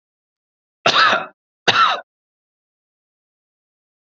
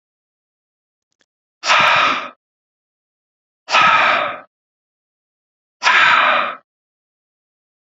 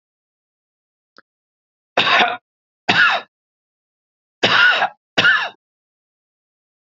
{
  "cough_length": "4.0 s",
  "cough_amplitude": 28360,
  "cough_signal_mean_std_ratio": 0.32,
  "exhalation_length": "7.9 s",
  "exhalation_amplitude": 29323,
  "exhalation_signal_mean_std_ratio": 0.41,
  "three_cough_length": "6.8 s",
  "three_cough_amplitude": 29564,
  "three_cough_signal_mean_std_ratio": 0.37,
  "survey_phase": "beta (2021-08-13 to 2022-03-07)",
  "age": "45-64",
  "gender": "Male",
  "wearing_mask": "No",
  "symptom_none": true,
  "smoker_status": "Never smoked",
  "respiratory_condition_asthma": false,
  "respiratory_condition_other": false,
  "recruitment_source": "REACT",
  "submission_delay": "2 days",
  "covid_test_result": "Negative",
  "covid_test_method": "RT-qPCR",
  "influenza_a_test_result": "Negative",
  "influenza_b_test_result": "Negative"
}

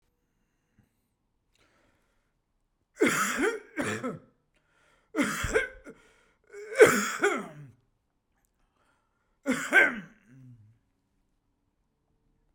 {
  "three_cough_length": "12.5 s",
  "three_cough_amplitude": 20731,
  "three_cough_signal_mean_std_ratio": 0.31,
  "survey_phase": "beta (2021-08-13 to 2022-03-07)",
  "age": "45-64",
  "gender": "Male",
  "wearing_mask": "No",
  "symptom_none": true,
  "smoker_status": "Ex-smoker",
  "respiratory_condition_asthma": false,
  "respiratory_condition_other": false,
  "recruitment_source": "REACT",
  "submission_delay": "1 day",
  "covid_test_result": "Negative",
  "covid_test_method": "RT-qPCR",
  "influenza_a_test_result": "Negative",
  "influenza_b_test_result": "Negative"
}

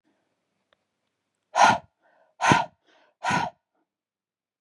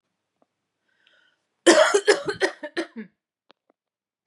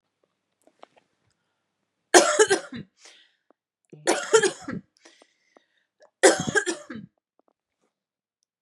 {
  "exhalation_length": "4.6 s",
  "exhalation_amplitude": 28378,
  "exhalation_signal_mean_std_ratio": 0.29,
  "cough_length": "4.3 s",
  "cough_amplitude": 29429,
  "cough_signal_mean_std_ratio": 0.3,
  "three_cough_length": "8.6 s",
  "three_cough_amplitude": 32767,
  "three_cough_signal_mean_std_ratio": 0.27,
  "survey_phase": "beta (2021-08-13 to 2022-03-07)",
  "age": "18-44",
  "gender": "Female",
  "wearing_mask": "No",
  "symptom_none": true,
  "smoker_status": "Never smoked",
  "respiratory_condition_asthma": false,
  "respiratory_condition_other": false,
  "recruitment_source": "REACT",
  "submission_delay": "1 day",
  "covid_test_result": "Negative",
  "covid_test_method": "RT-qPCR",
  "influenza_a_test_result": "Negative",
  "influenza_b_test_result": "Negative"
}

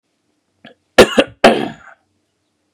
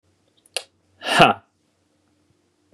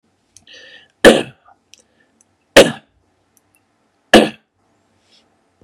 {
  "cough_length": "2.7 s",
  "cough_amplitude": 32768,
  "cough_signal_mean_std_ratio": 0.28,
  "exhalation_length": "2.7 s",
  "exhalation_amplitude": 32767,
  "exhalation_signal_mean_std_ratio": 0.24,
  "three_cough_length": "5.6 s",
  "three_cough_amplitude": 32768,
  "three_cough_signal_mean_std_ratio": 0.22,
  "survey_phase": "beta (2021-08-13 to 2022-03-07)",
  "age": "18-44",
  "gender": "Male",
  "wearing_mask": "No",
  "symptom_cough_any": true,
  "symptom_runny_or_blocked_nose": true,
  "symptom_shortness_of_breath": true,
  "symptom_fatigue": true,
  "symptom_fever_high_temperature": true,
  "symptom_headache": true,
  "symptom_change_to_sense_of_smell_or_taste": true,
  "symptom_other": true,
  "symptom_onset": "1 day",
  "smoker_status": "Never smoked",
  "respiratory_condition_asthma": false,
  "respiratory_condition_other": false,
  "recruitment_source": "Test and Trace",
  "submission_delay": "1 day",
  "covid_test_result": "Positive",
  "covid_test_method": "RT-qPCR",
  "covid_ct_value": 20.9,
  "covid_ct_gene": "ORF1ab gene",
  "covid_ct_mean": 21.8,
  "covid_viral_load": "71000 copies/ml",
  "covid_viral_load_category": "Low viral load (10K-1M copies/ml)"
}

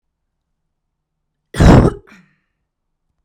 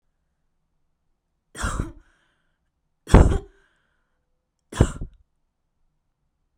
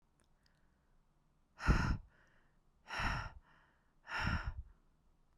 {
  "cough_length": "3.2 s",
  "cough_amplitude": 32768,
  "cough_signal_mean_std_ratio": 0.26,
  "three_cough_length": "6.6 s",
  "three_cough_amplitude": 32768,
  "three_cough_signal_mean_std_ratio": 0.2,
  "exhalation_length": "5.4 s",
  "exhalation_amplitude": 4598,
  "exhalation_signal_mean_std_ratio": 0.37,
  "survey_phase": "beta (2021-08-13 to 2022-03-07)",
  "age": "18-44",
  "gender": "Female",
  "wearing_mask": "No",
  "symptom_none": true,
  "smoker_status": "Ex-smoker",
  "respiratory_condition_asthma": false,
  "respiratory_condition_other": false,
  "recruitment_source": "REACT",
  "submission_delay": "1 day",
  "covid_test_result": "Negative",
  "covid_test_method": "RT-qPCR"
}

